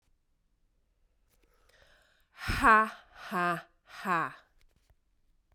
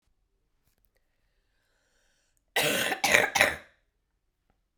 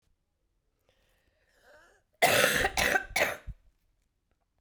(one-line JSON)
{"exhalation_length": "5.5 s", "exhalation_amplitude": 12433, "exhalation_signal_mean_std_ratio": 0.3, "cough_length": "4.8 s", "cough_amplitude": 27946, "cough_signal_mean_std_ratio": 0.31, "three_cough_length": "4.6 s", "three_cough_amplitude": 11006, "three_cough_signal_mean_std_ratio": 0.37, "survey_phase": "beta (2021-08-13 to 2022-03-07)", "age": "18-44", "gender": "Female", "wearing_mask": "No", "symptom_cough_any": true, "symptom_runny_or_blocked_nose": true, "symptom_fatigue": true, "symptom_headache": true, "symptom_change_to_sense_of_smell_or_taste": true, "symptom_onset": "7 days", "smoker_status": "Ex-smoker", "respiratory_condition_asthma": false, "respiratory_condition_other": false, "recruitment_source": "Test and Trace", "submission_delay": "2 days", "covid_test_result": "Positive", "covid_test_method": "RT-qPCR", "covid_ct_value": 17.7, "covid_ct_gene": "ORF1ab gene", "covid_ct_mean": 18.1, "covid_viral_load": "1100000 copies/ml", "covid_viral_load_category": "High viral load (>1M copies/ml)"}